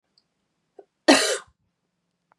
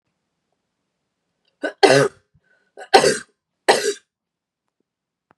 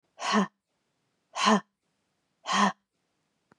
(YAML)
cough_length: 2.4 s
cough_amplitude: 28217
cough_signal_mean_std_ratio: 0.25
three_cough_length: 5.4 s
three_cough_amplitude: 32768
three_cough_signal_mean_std_ratio: 0.27
exhalation_length: 3.6 s
exhalation_amplitude: 12661
exhalation_signal_mean_std_ratio: 0.35
survey_phase: beta (2021-08-13 to 2022-03-07)
age: 18-44
gender: Female
wearing_mask: 'No'
symptom_cough_any: true
symptom_runny_or_blocked_nose: true
symptom_shortness_of_breath: true
symptom_headache: true
symptom_onset: 7 days
smoker_status: Ex-smoker
respiratory_condition_asthma: false
respiratory_condition_other: false
recruitment_source: Test and Trace
submission_delay: 1 day
covid_test_result: Positive
covid_test_method: RT-qPCR
covid_ct_value: 27.8
covid_ct_gene: N gene